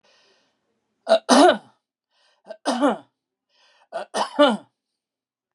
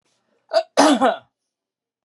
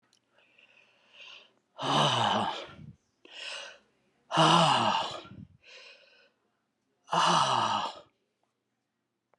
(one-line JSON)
{"three_cough_length": "5.5 s", "three_cough_amplitude": 28753, "three_cough_signal_mean_std_ratio": 0.32, "cough_length": "2.0 s", "cough_amplitude": 26800, "cough_signal_mean_std_ratio": 0.38, "exhalation_length": "9.4 s", "exhalation_amplitude": 11005, "exhalation_signal_mean_std_ratio": 0.44, "survey_phase": "beta (2021-08-13 to 2022-03-07)", "age": "65+", "gender": "Male", "wearing_mask": "No", "symptom_none": true, "smoker_status": "Never smoked", "respiratory_condition_asthma": false, "respiratory_condition_other": false, "recruitment_source": "REACT", "submission_delay": "1 day", "covid_test_result": "Negative", "covid_test_method": "RT-qPCR", "influenza_a_test_result": "Unknown/Void", "influenza_b_test_result": "Unknown/Void"}